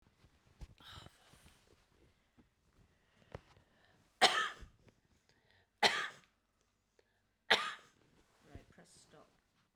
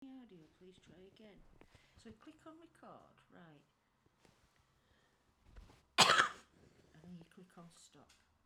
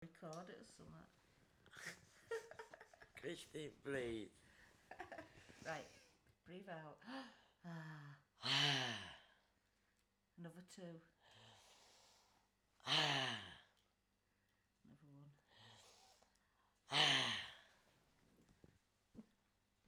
{"three_cough_length": "9.8 s", "three_cough_amplitude": 9695, "three_cough_signal_mean_std_ratio": 0.22, "cough_length": "8.5 s", "cough_amplitude": 7663, "cough_signal_mean_std_ratio": 0.21, "exhalation_length": "19.9 s", "exhalation_amplitude": 2820, "exhalation_signal_mean_std_ratio": 0.38, "survey_phase": "beta (2021-08-13 to 2022-03-07)", "age": "45-64", "gender": "Female", "wearing_mask": "Prefer not to say", "symptom_none": true, "smoker_status": "Current smoker (11 or more cigarettes per day)", "respiratory_condition_asthma": true, "respiratory_condition_other": true, "recruitment_source": "REACT", "submission_delay": "3 days", "covid_test_result": "Negative", "covid_test_method": "RT-qPCR", "covid_ct_value": 26.0, "covid_ct_gene": "N gene"}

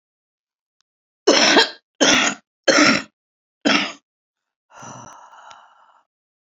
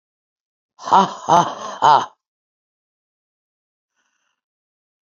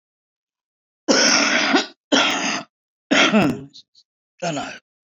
{"three_cough_length": "6.5 s", "three_cough_amplitude": 29483, "three_cough_signal_mean_std_ratio": 0.37, "exhalation_length": "5.0 s", "exhalation_amplitude": 30593, "exhalation_signal_mean_std_ratio": 0.28, "cough_length": "5.0 s", "cough_amplitude": 27164, "cough_signal_mean_std_ratio": 0.52, "survey_phase": "beta (2021-08-13 to 2022-03-07)", "age": "45-64", "gender": "Female", "wearing_mask": "No", "symptom_cough_any": true, "symptom_runny_or_blocked_nose": true, "symptom_shortness_of_breath": true, "symptom_sore_throat": true, "symptom_fatigue": true, "symptom_headache": true, "smoker_status": "Current smoker (11 or more cigarettes per day)", "respiratory_condition_asthma": false, "respiratory_condition_other": false, "recruitment_source": "Test and Trace", "submission_delay": "1 day", "covid_test_result": "Positive", "covid_test_method": "RT-qPCR", "covid_ct_value": 21.5, "covid_ct_gene": "ORF1ab gene", "covid_ct_mean": 21.6, "covid_viral_load": "85000 copies/ml", "covid_viral_load_category": "Low viral load (10K-1M copies/ml)"}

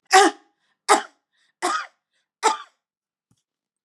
{"three_cough_length": "3.8 s", "three_cough_amplitude": 30518, "three_cough_signal_mean_std_ratio": 0.29, "survey_phase": "beta (2021-08-13 to 2022-03-07)", "age": "65+", "gender": "Female", "wearing_mask": "No", "symptom_none": true, "smoker_status": "Never smoked", "respiratory_condition_asthma": false, "respiratory_condition_other": false, "recruitment_source": "REACT", "submission_delay": "1 day", "covid_test_result": "Negative", "covid_test_method": "RT-qPCR", "influenza_a_test_result": "Negative", "influenza_b_test_result": "Negative"}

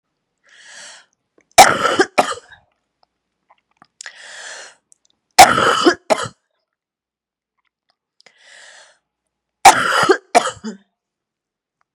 {"three_cough_length": "11.9 s", "three_cough_amplitude": 32768, "three_cough_signal_mean_std_ratio": 0.28, "survey_phase": "beta (2021-08-13 to 2022-03-07)", "age": "45-64", "gender": "Female", "wearing_mask": "No", "symptom_runny_or_blocked_nose": true, "symptom_sore_throat": true, "symptom_headache": true, "symptom_onset": "3 days", "smoker_status": "Never smoked", "respiratory_condition_asthma": false, "respiratory_condition_other": false, "recruitment_source": "Test and Trace", "submission_delay": "2 days", "covid_test_result": "Positive", "covid_test_method": "RT-qPCR", "covid_ct_value": 18.8, "covid_ct_gene": "ORF1ab gene", "covid_ct_mean": 19.7, "covid_viral_load": "330000 copies/ml", "covid_viral_load_category": "Low viral load (10K-1M copies/ml)"}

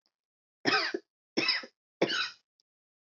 {"three_cough_length": "3.1 s", "three_cough_amplitude": 7169, "three_cough_signal_mean_std_ratio": 0.4, "survey_phase": "alpha (2021-03-01 to 2021-08-12)", "age": "45-64", "gender": "Female", "wearing_mask": "No", "symptom_none": true, "symptom_cough_any": true, "smoker_status": "Never smoked", "respiratory_condition_asthma": false, "respiratory_condition_other": false, "recruitment_source": "REACT", "submission_delay": "1 day", "covid_test_result": "Negative", "covid_test_method": "RT-qPCR"}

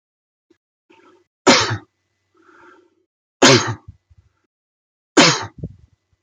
{"three_cough_length": "6.2 s", "three_cough_amplitude": 32768, "three_cough_signal_mean_std_ratio": 0.28, "survey_phase": "beta (2021-08-13 to 2022-03-07)", "age": "45-64", "gender": "Male", "wearing_mask": "No", "symptom_none": true, "smoker_status": "Never smoked", "respiratory_condition_asthma": false, "respiratory_condition_other": false, "recruitment_source": "REACT", "submission_delay": "5 days", "covid_test_result": "Negative", "covid_test_method": "RT-qPCR"}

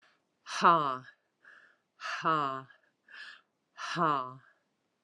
{"exhalation_length": "5.0 s", "exhalation_amplitude": 9621, "exhalation_signal_mean_std_ratio": 0.37, "survey_phase": "alpha (2021-03-01 to 2021-08-12)", "age": "45-64", "gender": "Female", "wearing_mask": "Yes", "symptom_cough_any": true, "symptom_shortness_of_breath": true, "symptom_headache": true, "symptom_change_to_sense_of_smell_or_taste": true, "symptom_loss_of_taste": true, "symptom_onset": "4 days", "smoker_status": "Never smoked", "respiratory_condition_asthma": false, "respiratory_condition_other": false, "recruitment_source": "Test and Trace", "submission_delay": "2 days", "covid_test_result": "Positive", "covid_test_method": "RT-qPCR", "covid_ct_value": 16.3, "covid_ct_gene": "ORF1ab gene", "covid_ct_mean": 16.7, "covid_viral_load": "3200000 copies/ml", "covid_viral_load_category": "High viral load (>1M copies/ml)"}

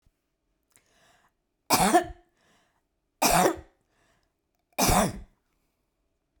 {"three_cough_length": "6.4 s", "three_cough_amplitude": 16004, "three_cough_signal_mean_std_ratio": 0.32, "survey_phase": "beta (2021-08-13 to 2022-03-07)", "age": "65+", "gender": "Female", "wearing_mask": "No", "symptom_none": true, "smoker_status": "Ex-smoker", "respiratory_condition_asthma": false, "respiratory_condition_other": false, "recruitment_source": "REACT", "submission_delay": "1 day", "covid_test_result": "Negative", "covid_test_method": "RT-qPCR"}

